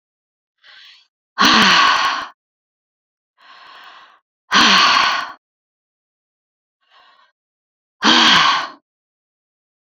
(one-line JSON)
{"exhalation_length": "9.9 s", "exhalation_amplitude": 32767, "exhalation_signal_mean_std_ratio": 0.4, "survey_phase": "beta (2021-08-13 to 2022-03-07)", "age": "65+", "gender": "Female", "wearing_mask": "No", "symptom_none": true, "smoker_status": "Ex-smoker", "respiratory_condition_asthma": false, "respiratory_condition_other": false, "recruitment_source": "REACT", "submission_delay": "2 days", "covid_test_result": "Negative", "covid_test_method": "RT-qPCR"}